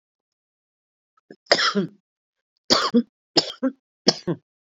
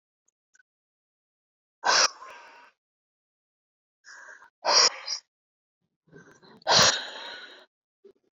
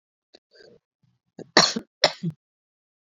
{"three_cough_length": "4.7 s", "three_cough_amplitude": 32046, "three_cough_signal_mean_std_ratio": 0.33, "exhalation_length": "8.4 s", "exhalation_amplitude": 14958, "exhalation_signal_mean_std_ratio": 0.29, "cough_length": "3.2 s", "cough_amplitude": 30452, "cough_signal_mean_std_ratio": 0.22, "survey_phase": "beta (2021-08-13 to 2022-03-07)", "age": "45-64", "gender": "Female", "wearing_mask": "No", "symptom_none": true, "smoker_status": "Current smoker (1 to 10 cigarettes per day)", "respiratory_condition_asthma": false, "respiratory_condition_other": true, "recruitment_source": "REACT", "submission_delay": "1 day", "covid_test_result": "Negative", "covid_test_method": "RT-qPCR"}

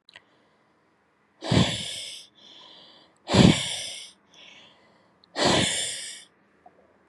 {"exhalation_length": "7.1 s", "exhalation_amplitude": 23494, "exhalation_signal_mean_std_ratio": 0.36, "survey_phase": "beta (2021-08-13 to 2022-03-07)", "age": "18-44", "gender": "Female", "wearing_mask": "No", "symptom_cough_any": true, "symptom_new_continuous_cough": true, "symptom_runny_or_blocked_nose": true, "symptom_sore_throat": true, "symptom_fatigue": true, "symptom_fever_high_temperature": true, "symptom_headache": true, "symptom_change_to_sense_of_smell_or_taste": true, "symptom_loss_of_taste": true, "symptom_onset": "6 days", "smoker_status": "Never smoked", "respiratory_condition_asthma": false, "respiratory_condition_other": false, "recruitment_source": "Test and Trace", "submission_delay": "1 day", "covid_test_result": "Positive", "covid_test_method": "RT-qPCR", "covid_ct_value": 22.3, "covid_ct_gene": "ORF1ab gene"}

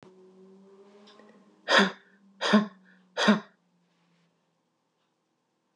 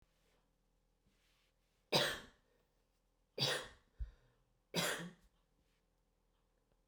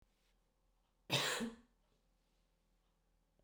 {"exhalation_length": "5.8 s", "exhalation_amplitude": 16967, "exhalation_signal_mean_std_ratio": 0.28, "three_cough_length": "6.9 s", "three_cough_amplitude": 3610, "three_cough_signal_mean_std_ratio": 0.29, "cough_length": "3.4 s", "cough_amplitude": 2549, "cough_signal_mean_std_ratio": 0.29, "survey_phase": "beta (2021-08-13 to 2022-03-07)", "age": "45-64", "gender": "Female", "wearing_mask": "No", "symptom_cough_any": true, "symptom_shortness_of_breath": true, "symptom_onset": "5 days", "smoker_status": "Ex-smoker", "respiratory_condition_asthma": true, "respiratory_condition_other": false, "recruitment_source": "REACT", "submission_delay": "1 day", "covid_test_result": "Negative", "covid_test_method": "RT-qPCR", "influenza_a_test_result": "Negative", "influenza_b_test_result": "Negative"}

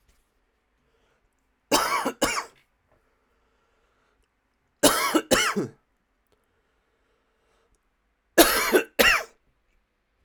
{"three_cough_length": "10.2 s", "three_cough_amplitude": 32076, "three_cough_signal_mean_std_ratio": 0.32, "survey_phase": "alpha (2021-03-01 to 2021-08-12)", "age": "18-44", "gender": "Male", "wearing_mask": "No", "symptom_shortness_of_breath": true, "symptom_change_to_sense_of_smell_or_taste": true, "symptom_loss_of_taste": true, "symptom_onset": "3 days", "smoker_status": "Ex-smoker", "respiratory_condition_asthma": false, "respiratory_condition_other": false, "recruitment_source": "Test and Trace", "submission_delay": "2 days", "covid_test_result": "Positive", "covid_test_method": "RT-qPCR", "covid_ct_value": 10.4, "covid_ct_gene": "N gene", "covid_ct_mean": 10.5, "covid_viral_load": "360000000 copies/ml", "covid_viral_load_category": "High viral load (>1M copies/ml)"}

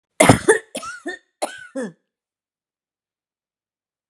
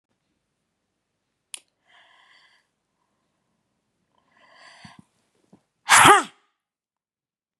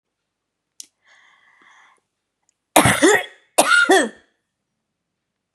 {"three_cough_length": "4.1 s", "three_cough_amplitude": 32768, "three_cough_signal_mean_std_ratio": 0.25, "exhalation_length": "7.6 s", "exhalation_amplitude": 32768, "exhalation_signal_mean_std_ratio": 0.17, "cough_length": "5.5 s", "cough_amplitude": 32768, "cough_signal_mean_std_ratio": 0.33, "survey_phase": "beta (2021-08-13 to 2022-03-07)", "age": "65+", "gender": "Female", "wearing_mask": "No", "symptom_none": true, "smoker_status": "Ex-smoker", "respiratory_condition_asthma": false, "respiratory_condition_other": false, "recruitment_source": "REACT", "submission_delay": "1 day", "covid_test_result": "Negative", "covid_test_method": "RT-qPCR"}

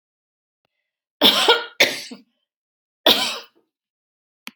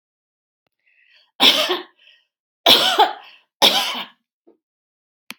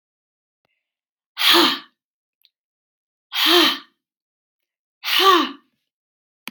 {"cough_length": "4.6 s", "cough_amplitude": 32427, "cough_signal_mean_std_ratio": 0.32, "three_cough_length": "5.4 s", "three_cough_amplitude": 32767, "three_cough_signal_mean_std_ratio": 0.35, "exhalation_length": "6.5 s", "exhalation_amplitude": 27723, "exhalation_signal_mean_std_ratio": 0.35, "survey_phase": "alpha (2021-03-01 to 2021-08-12)", "age": "65+", "gender": "Female", "wearing_mask": "No", "symptom_none": true, "smoker_status": "Ex-smoker", "respiratory_condition_asthma": false, "respiratory_condition_other": false, "recruitment_source": "REACT", "submission_delay": "3 days", "covid_test_result": "Negative", "covid_test_method": "RT-qPCR"}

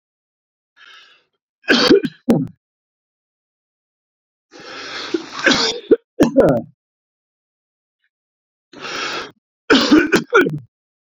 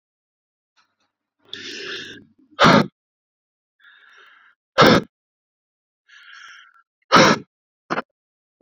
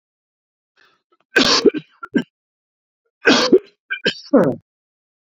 {"three_cough_length": "11.2 s", "three_cough_amplitude": 31820, "three_cough_signal_mean_std_ratio": 0.37, "exhalation_length": "8.6 s", "exhalation_amplitude": 29383, "exhalation_signal_mean_std_ratio": 0.26, "cough_length": "5.4 s", "cough_amplitude": 32767, "cough_signal_mean_std_ratio": 0.35, "survey_phase": "beta (2021-08-13 to 2022-03-07)", "age": "45-64", "gender": "Male", "wearing_mask": "No", "symptom_cough_any": true, "symptom_runny_or_blocked_nose": true, "symptom_fatigue": true, "symptom_onset": "12 days", "smoker_status": "Ex-smoker", "respiratory_condition_asthma": false, "respiratory_condition_other": false, "recruitment_source": "REACT", "submission_delay": "0 days", "covid_test_result": "Negative", "covid_test_method": "RT-qPCR"}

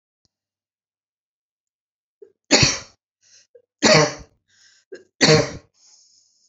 {"three_cough_length": "6.5 s", "three_cough_amplitude": 32768, "three_cough_signal_mean_std_ratio": 0.28, "survey_phase": "beta (2021-08-13 to 2022-03-07)", "age": "65+", "gender": "Female", "wearing_mask": "No", "symptom_none": true, "smoker_status": "Ex-smoker", "respiratory_condition_asthma": false, "respiratory_condition_other": false, "recruitment_source": "REACT", "submission_delay": "2 days", "covid_test_result": "Negative", "covid_test_method": "RT-qPCR"}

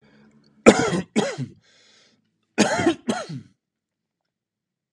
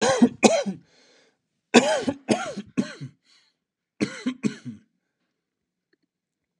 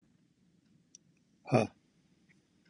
{"cough_length": "4.9 s", "cough_amplitude": 32768, "cough_signal_mean_std_ratio": 0.32, "three_cough_length": "6.6 s", "three_cough_amplitude": 32671, "three_cough_signal_mean_std_ratio": 0.34, "exhalation_length": "2.7 s", "exhalation_amplitude": 7261, "exhalation_signal_mean_std_ratio": 0.19, "survey_phase": "beta (2021-08-13 to 2022-03-07)", "age": "18-44", "gender": "Male", "wearing_mask": "No", "symptom_cough_any": true, "symptom_runny_or_blocked_nose": true, "smoker_status": "Never smoked", "respiratory_condition_asthma": false, "respiratory_condition_other": false, "recruitment_source": "REACT", "submission_delay": "-1 day", "covid_test_result": "Negative", "covid_test_method": "RT-qPCR"}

